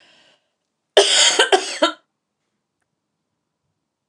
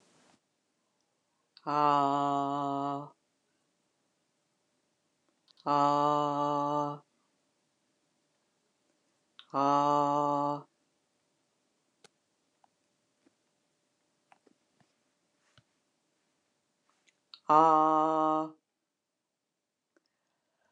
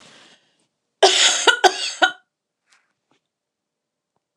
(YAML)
three_cough_length: 4.1 s
three_cough_amplitude: 29204
three_cough_signal_mean_std_ratio: 0.33
exhalation_length: 20.7 s
exhalation_amplitude: 10926
exhalation_signal_mean_std_ratio: 0.33
cough_length: 4.4 s
cough_amplitude: 29204
cough_signal_mean_std_ratio: 0.32
survey_phase: beta (2021-08-13 to 2022-03-07)
age: 65+
gender: Female
wearing_mask: 'No'
symptom_fatigue: true
smoker_status: Ex-smoker
respiratory_condition_asthma: false
respiratory_condition_other: false
recruitment_source: REACT
submission_delay: 1 day
covid_test_result: Negative
covid_test_method: RT-qPCR